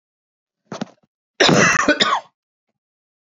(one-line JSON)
{"cough_length": "3.2 s", "cough_amplitude": 28018, "cough_signal_mean_std_ratio": 0.4, "survey_phase": "beta (2021-08-13 to 2022-03-07)", "age": "45-64", "gender": "Female", "wearing_mask": "No", "symptom_cough_any": true, "smoker_status": "Never smoked", "respiratory_condition_asthma": false, "respiratory_condition_other": false, "recruitment_source": "REACT", "submission_delay": "2 days", "covid_test_result": "Negative", "covid_test_method": "RT-qPCR"}